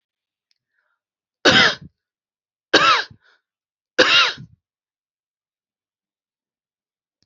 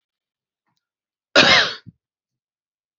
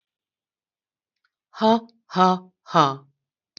three_cough_length: 7.3 s
three_cough_amplitude: 32767
three_cough_signal_mean_std_ratio: 0.28
cough_length: 3.0 s
cough_amplitude: 30916
cough_signal_mean_std_ratio: 0.27
exhalation_length: 3.6 s
exhalation_amplitude: 26695
exhalation_signal_mean_std_ratio: 0.3
survey_phase: beta (2021-08-13 to 2022-03-07)
age: 65+
gender: Female
wearing_mask: 'No'
symptom_none: true
smoker_status: Ex-smoker
respiratory_condition_asthma: false
respiratory_condition_other: false
recruitment_source: REACT
submission_delay: 1 day
covid_test_result: Negative
covid_test_method: RT-qPCR
influenza_a_test_result: Negative
influenza_b_test_result: Negative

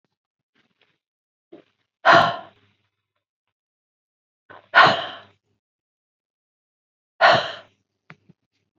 exhalation_length: 8.8 s
exhalation_amplitude: 28540
exhalation_signal_mean_std_ratio: 0.23
survey_phase: beta (2021-08-13 to 2022-03-07)
age: 65+
gender: Female
wearing_mask: 'No'
symptom_none: true
smoker_status: Ex-smoker
respiratory_condition_asthma: false
respiratory_condition_other: false
recruitment_source: REACT
submission_delay: 0 days
covid_test_result: Negative
covid_test_method: RT-qPCR
influenza_a_test_result: Negative
influenza_b_test_result: Negative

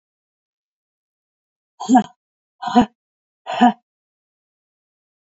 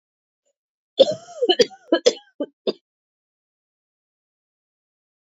exhalation_length: 5.4 s
exhalation_amplitude: 27873
exhalation_signal_mean_std_ratio: 0.24
cough_length: 5.2 s
cough_amplitude: 28041
cough_signal_mean_std_ratio: 0.23
survey_phase: beta (2021-08-13 to 2022-03-07)
age: 45-64
gender: Female
wearing_mask: 'No'
symptom_cough_any: true
symptom_runny_or_blocked_nose: true
symptom_fatigue: true
symptom_change_to_sense_of_smell_or_taste: true
symptom_loss_of_taste: true
symptom_onset: 3 days
smoker_status: Never smoked
respiratory_condition_asthma: true
respiratory_condition_other: false
recruitment_source: Test and Trace
submission_delay: 2 days
covid_test_result: Positive
covid_test_method: RT-qPCR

